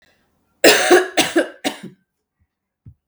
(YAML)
cough_length: 3.1 s
cough_amplitude: 32768
cough_signal_mean_std_ratio: 0.38
survey_phase: beta (2021-08-13 to 2022-03-07)
age: 18-44
gender: Female
wearing_mask: 'No'
symptom_cough_any: true
symptom_runny_or_blocked_nose: true
symptom_fatigue: true
symptom_change_to_sense_of_smell_or_taste: true
symptom_loss_of_taste: true
symptom_onset: 3 days
smoker_status: Never smoked
respiratory_condition_asthma: false
respiratory_condition_other: false
recruitment_source: Test and Trace
submission_delay: 2 days
covid_test_result: Positive
covid_test_method: RT-qPCR
covid_ct_value: 20.9
covid_ct_gene: S gene
covid_ct_mean: 21.6
covid_viral_load: 81000 copies/ml
covid_viral_load_category: Low viral load (10K-1M copies/ml)